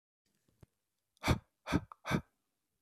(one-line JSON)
{"exhalation_length": "2.8 s", "exhalation_amplitude": 4492, "exhalation_signal_mean_std_ratio": 0.28, "survey_phase": "beta (2021-08-13 to 2022-03-07)", "age": "45-64", "gender": "Male", "wearing_mask": "No", "symptom_cough_any": true, "symptom_onset": "12 days", "smoker_status": "Ex-smoker", "respiratory_condition_asthma": false, "respiratory_condition_other": false, "recruitment_source": "REACT", "submission_delay": "1 day", "covid_test_result": "Negative", "covid_test_method": "RT-qPCR", "influenza_a_test_result": "Negative", "influenza_b_test_result": "Negative"}